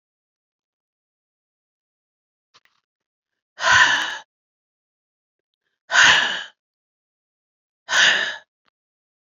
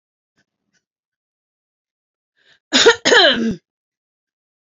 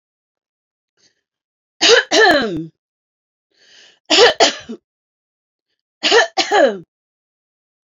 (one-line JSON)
{"exhalation_length": "9.4 s", "exhalation_amplitude": 29049, "exhalation_signal_mean_std_ratio": 0.29, "cough_length": "4.6 s", "cough_amplitude": 30974, "cough_signal_mean_std_ratio": 0.3, "three_cough_length": "7.9 s", "three_cough_amplitude": 32768, "three_cough_signal_mean_std_ratio": 0.37, "survey_phase": "beta (2021-08-13 to 2022-03-07)", "age": "45-64", "gender": "Female", "wearing_mask": "No", "symptom_none": true, "smoker_status": "Never smoked", "respiratory_condition_asthma": false, "respiratory_condition_other": false, "recruitment_source": "REACT", "submission_delay": "2 days", "covid_test_result": "Negative", "covid_test_method": "RT-qPCR"}